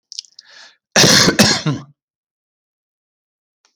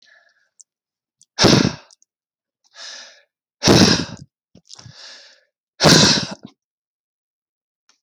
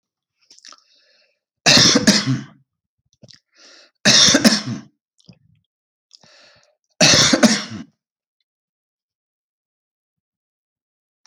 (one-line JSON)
{"cough_length": "3.8 s", "cough_amplitude": 32768, "cough_signal_mean_std_ratio": 0.36, "exhalation_length": "8.0 s", "exhalation_amplitude": 32121, "exhalation_signal_mean_std_ratio": 0.31, "three_cough_length": "11.3 s", "three_cough_amplitude": 32768, "three_cough_signal_mean_std_ratio": 0.32, "survey_phase": "alpha (2021-03-01 to 2021-08-12)", "age": "45-64", "gender": "Male", "wearing_mask": "No", "symptom_none": true, "smoker_status": "Never smoked", "respiratory_condition_asthma": true, "respiratory_condition_other": false, "recruitment_source": "REACT", "submission_delay": "1 day", "covid_test_result": "Negative", "covid_test_method": "RT-qPCR"}